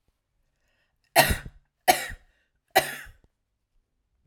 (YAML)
three_cough_length: 4.3 s
three_cough_amplitude: 26071
three_cough_signal_mean_std_ratio: 0.25
survey_phase: alpha (2021-03-01 to 2021-08-12)
age: 18-44
gender: Female
wearing_mask: 'No'
symptom_none: true
smoker_status: Ex-smoker
respiratory_condition_asthma: false
respiratory_condition_other: false
recruitment_source: REACT
submission_delay: 1 day
covid_test_result: Negative
covid_test_method: RT-qPCR